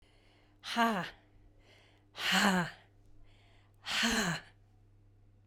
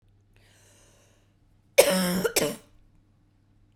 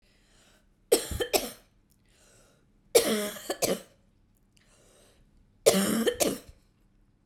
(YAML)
exhalation_length: 5.5 s
exhalation_amplitude: 6093
exhalation_signal_mean_std_ratio: 0.45
cough_length: 3.8 s
cough_amplitude: 27503
cough_signal_mean_std_ratio: 0.31
three_cough_length: 7.3 s
three_cough_amplitude: 18347
three_cough_signal_mean_std_ratio: 0.36
survey_phase: beta (2021-08-13 to 2022-03-07)
age: 18-44
gender: Female
wearing_mask: 'No'
symptom_cough_any: true
symptom_new_continuous_cough: true
symptom_runny_or_blocked_nose: true
symptom_shortness_of_breath: true
symptom_sore_throat: true
symptom_fatigue: true
symptom_headache: true
symptom_other: true
symptom_onset: 6 days
smoker_status: Ex-smoker
respiratory_condition_asthma: true
respiratory_condition_other: false
recruitment_source: REACT
submission_delay: 3 days
covid_test_result: Positive
covid_test_method: RT-qPCR
covid_ct_value: 24.0
covid_ct_gene: E gene
influenza_a_test_result: Negative
influenza_b_test_result: Negative